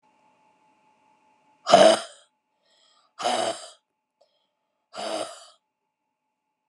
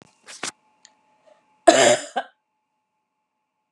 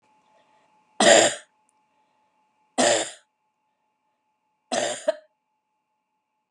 {"exhalation_length": "6.7 s", "exhalation_amplitude": 26116, "exhalation_signal_mean_std_ratio": 0.25, "cough_length": "3.7 s", "cough_amplitude": 32578, "cough_signal_mean_std_ratio": 0.25, "three_cough_length": "6.5 s", "three_cough_amplitude": 27127, "three_cough_signal_mean_std_ratio": 0.28, "survey_phase": "beta (2021-08-13 to 2022-03-07)", "age": "45-64", "gender": "Female", "wearing_mask": "No", "symptom_cough_any": true, "symptom_runny_or_blocked_nose": true, "symptom_sore_throat": true, "symptom_fatigue": true, "symptom_fever_high_temperature": true, "symptom_headache": true, "symptom_change_to_sense_of_smell_or_taste": true, "symptom_onset": "2 days", "smoker_status": "Never smoked", "respiratory_condition_asthma": true, "respiratory_condition_other": false, "recruitment_source": "Test and Trace", "submission_delay": "2 days", "covid_test_result": "Positive", "covid_test_method": "RT-qPCR", "covid_ct_value": 10.7, "covid_ct_gene": "ORF1ab gene"}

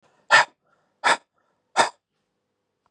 {"exhalation_length": "2.9 s", "exhalation_amplitude": 26590, "exhalation_signal_mean_std_ratio": 0.27, "survey_phase": "beta (2021-08-13 to 2022-03-07)", "age": "45-64", "gender": "Male", "wearing_mask": "No", "symptom_none": true, "symptom_onset": "13 days", "smoker_status": "Ex-smoker", "respiratory_condition_asthma": false, "respiratory_condition_other": false, "recruitment_source": "REACT", "submission_delay": "2 days", "covid_test_result": "Negative", "covid_test_method": "RT-qPCR"}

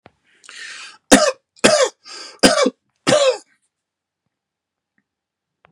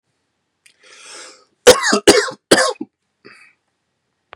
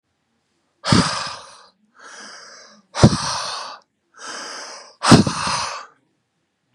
{"three_cough_length": "5.7 s", "three_cough_amplitude": 32768, "three_cough_signal_mean_std_ratio": 0.34, "cough_length": "4.4 s", "cough_amplitude": 32768, "cough_signal_mean_std_ratio": 0.3, "exhalation_length": "6.7 s", "exhalation_amplitude": 32768, "exhalation_signal_mean_std_ratio": 0.35, "survey_phase": "beta (2021-08-13 to 2022-03-07)", "age": "18-44", "gender": "Male", "wearing_mask": "No", "symptom_none": true, "smoker_status": "Ex-smoker", "respiratory_condition_asthma": false, "respiratory_condition_other": false, "recruitment_source": "REACT", "submission_delay": "2 days", "covid_test_result": "Negative", "covid_test_method": "RT-qPCR", "influenza_a_test_result": "Negative", "influenza_b_test_result": "Negative"}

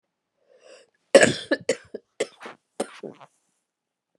{"cough_length": "4.2 s", "cough_amplitude": 30800, "cough_signal_mean_std_ratio": 0.22, "survey_phase": "beta (2021-08-13 to 2022-03-07)", "age": "45-64", "gender": "Female", "wearing_mask": "No", "symptom_cough_any": true, "symptom_sore_throat": true, "symptom_fatigue": true, "symptom_headache": true, "symptom_change_to_sense_of_smell_or_taste": true, "smoker_status": "Never smoked", "respiratory_condition_asthma": false, "respiratory_condition_other": false, "recruitment_source": "Test and Trace", "submission_delay": "1 day", "covid_test_result": "Positive", "covid_test_method": "RT-qPCR", "covid_ct_value": 20.6, "covid_ct_gene": "N gene", "covid_ct_mean": 21.0, "covid_viral_load": "130000 copies/ml", "covid_viral_load_category": "Low viral load (10K-1M copies/ml)"}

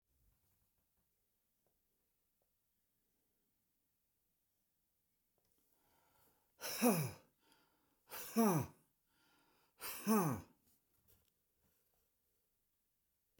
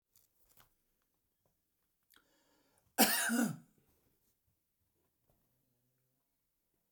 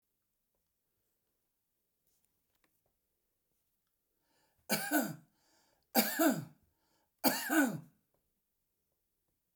{"exhalation_length": "13.4 s", "exhalation_amplitude": 3070, "exhalation_signal_mean_std_ratio": 0.25, "cough_length": "6.9 s", "cough_amplitude": 7399, "cough_signal_mean_std_ratio": 0.22, "three_cough_length": "9.6 s", "three_cough_amplitude": 6635, "three_cough_signal_mean_std_ratio": 0.28, "survey_phase": "beta (2021-08-13 to 2022-03-07)", "age": "65+", "gender": "Male", "wearing_mask": "No", "symptom_none": true, "smoker_status": "Ex-smoker", "respiratory_condition_asthma": false, "respiratory_condition_other": false, "recruitment_source": "REACT", "submission_delay": "2 days", "covid_test_result": "Negative", "covid_test_method": "RT-qPCR"}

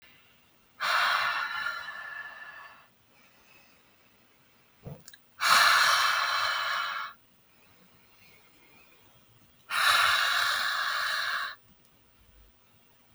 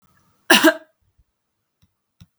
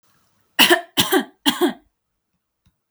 {"exhalation_length": "13.1 s", "exhalation_amplitude": 14395, "exhalation_signal_mean_std_ratio": 0.52, "cough_length": "2.4 s", "cough_amplitude": 32768, "cough_signal_mean_std_ratio": 0.24, "three_cough_length": "2.9 s", "three_cough_amplitude": 32768, "three_cough_signal_mean_std_ratio": 0.36, "survey_phase": "beta (2021-08-13 to 2022-03-07)", "age": "18-44", "gender": "Female", "wearing_mask": "No", "symptom_none": true, "smoker_status": "Never smoked", "respiratory_condition_asthma": false, "respiratory_condition_other": false, "recruitment_source": "REACT", "submission_delay": "2 days", "covid_test_result": "Negative", "covid_test_method": "RT-qPCR", "influenza_a_test_result": "Negative", "influenza_b_test_result": "Negative"}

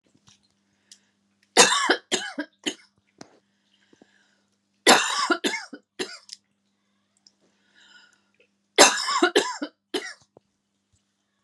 {"three_cough_length": "11.4 s", "three_cough_amplitude": 32767, "three_cough_signal_mean_std_ratio": 0.29, "survey_phase": "alpha (2021-03-01 to 2021-08-12)", "age": "45-64", "gender": "Female", "wearing_mask": "No", "symptom_none": true, "smoker_status": "Never smoked", "respiratory_condition_asthma": false, "respiratory_condition_other": false, "recruitment_source": "REACT", "submission_delay": "1 day", "covid_test_result": "Negative", "covid_test_method": "RT-qPCR"}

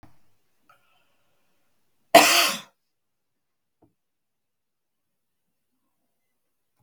{"cough_length": "6.8 s", "cough_amplitude": 32768, "cough_signal_mean_std_ratio": 0.18, "survey_phase": "beta (2021-08-13 to 2022-03-07)", "age": "65+", "gender": "Female", "wearing_mask": "No", "symptom_none": true, "symptom_onset": "12 days", "smoker_status": "Ex-smoker", "respiratory_condition_asthma": false, "respiratory_condition_other": false, "recruitment_source": "REACT", "submission_delay": "2 days", "covid_test_result": "Negative", "covid_test_method": "RT-qPCR", "influenza_a_test_result": "Negative", "influenza_b_test_result": "Negative"}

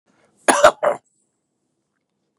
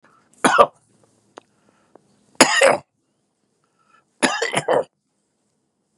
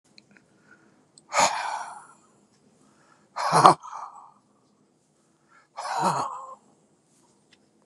{"cough_length": "2.4 s", "cough_amplitude": 32768, "cough_signal_mean_std_ratio": 0.27, "three_cough_length": "6.0 s", "three_cough_amplitude": 32768, "three_cough_signal_mean_std_ratio": 0.3, "exhalation_length": "7.9 s", "exhalation_amplitude": 32768, "exhalation_signal_mean_std_ratio": 0.29, "survey_phase": "beta (2021-08-13 to 2022-03-07)", "age": "65+", "gender": "Male", "wearing_mask": "No", "symptom_fatigue": true, "smoker_status": "Ex-smoker", "respiratory_condition_asthma": false, "respiratory_condition_other": false, "recruitment_source": "REACT", "submission_delay": "2 days", "covid_test_result": "Negative", "covid_test_method": "RT-qPCR", "influenza_a_test_result": "Negative", "influenza_b_test_result": "Negative"}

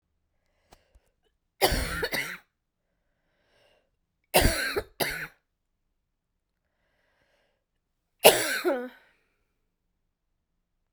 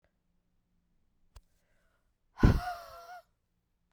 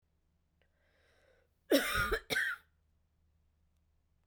{"three_cough_length": "10.9 s", "three_cough_amplitude": 32767, "three_cough_signal_mean_std_ratio": 0.27, "exhalation_length": "3.9 s", "exhalation_amplitude": 11959, "exhalation_signal_mean_std_ratio": 0.2, "cough_length": "4.3 s", "cough_amplitude": 5476, "cough_signal_mean_std_ratio": 0.33, "survey_phase": "beta (2021-08-13 to 2022-03-07)", "age": "45-64", "gender": "Female", "wearing_mask": "No", "symptom_cough_any": true, "symptom_runny_or_blocked_nose": true, "symptom_abdominal_pain": true, "symptom_diarrhoea": true, "symptom_fatigue": true, "symptom_headache": true, "symptom_change_to_sense_of_smell_or_taste": true, "symptom_loss_of_taste": true, "symptom_onset": "3 days", "smoker_status": "Ex-smoker", "respiratory_condition_asthma": true, "respiratory_condition_other": false, "recruitment_source": "Test and Trace", "submission_delay": "1 day", "covid_test_result": "Positive", "covid_test_method": "RT-qPCR", "covid_ct_value": 16.3, "covid_ct_gene": "ORF1ab gene", "covid_ct_mean": 17.0, "covid_viral_load": "2700000 copies/ml", "covid_viral_load_category": "High viral load (>1M copies/ml)"}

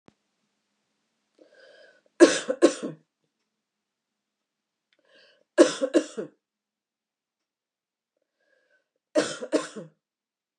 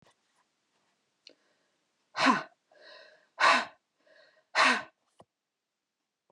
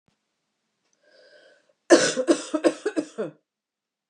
{"three_cough_length": "10.6 s", "three_cough_amplitude": 27284, "three_cough_signal_mean_std_ratio": 0.21, "exhalation_length": "6.3 s", "exhalation_amplitude": 10109, "exhalation_signal_mean_std_ratio": 0.27, "cough_length": "4.1 s", "cough_amplitude": 26803, "cough_signal_mean_std_ratio": 0.31, "survey_phase": "beta (2021-08-13 to 2022-03-07)", "age": "45-64", "gender": "Female", "wearing_mask": "No", "symptom_none": true, "smoker_status": "Never smoked", "respiratory_condition_asthma": false, "respiratory_condition_other": false, "recruitment_source": "REACT", "submission_delay": "2 days", "covid_test_result": "Negative", "covid_test_method": "RT-qPCR", "influenza_a_test_result": "Negative", "influenza_b_test_result": "Negative"}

